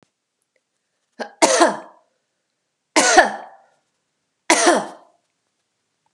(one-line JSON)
{"three_cough_length": "6.1 s", "three_cough_amplitude": 32768, "three_cough_signal_mean_std_ratio": 0.32, "survey_phase": "beta (2021-08-13 to 2022-03-07)", "age": "45-64", "gender": "Female", "wearing_mask": "No", "symptom_none": true, "smoker_status": "Never smoked", "respiratory_condition_asthma": false, "respiratory_condition_other": false, "recruitment_source": "REACT", "submission_delay": "2 days", "covid_test_result": "Negative", "covid_test_method": "RT-qPCR"}